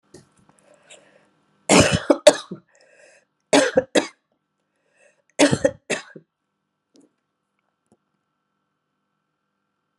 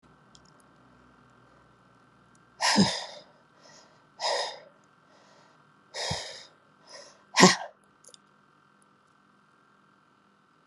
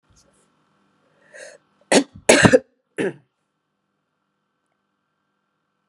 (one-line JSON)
{"three_cough_length": "10.0 s", "three_cough_amplitude": 32768, "three_cough_signal_mean_std_ratio": 0.24, "exhalation_length": "10.7 s", "exhalation_amplitude": 32113, "exhalation_signal_mean_std_ratio": 0.25, "cough_length": "5.9 s", "cough_amplitude": 32768, "cough_signal_mean_std_ratio": 0.22, "survey_phase": "alpha (2021-03-01 to 2021-08-12)", "age": "65+", "gender": "Female", "wearing_mask": "No", "symptom_cough_any": true, "symptom_fatigue": true, "symptom_headache": true, "symptom_change_to_sense_of_smell_or_taste": true, "smoker_status": "Never smoked", "respiratory_condition_asthma": false, "respiratory_condition_other": false, "recruitment_source": "Test and Trace", "submission_delay": "2 days", "covid_test_result": "Positive", "covid_test_method": "RT-qPCR", "covid_ct_value": 33.1, "covid_ct_gene": "ORF1ab gene", "covid_ct_mean": 33.6, "covid_viral_load": "9.7 copies/ml", "covid_viral_load_category": "Minimal viral load (< 10K copies/ml)"}